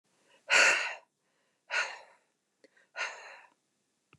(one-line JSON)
{"exhalation_length": "4.2 s", "exhalation_amplitude": 9596, "exhalation_signal_mean_std_ratio": 0.32, "survey_phase": "beta (2021-08-13 to 2022-03-07)", "age": "45-64", "gender": "Female", "wearing_mask": "No", "symptom_none": true, "smoker_status": "Never smoked", "respiratory_condition_asthma": false, "respiratory_condition_other": false, "recruitment_source": "REACT", "submission_delay": "1 day", "covid_test_result": "Negative", "covid_test_method": "RT-qPCR", "influenza_a_test_result": "Negative", "influenza_b_test_result": "Negative"}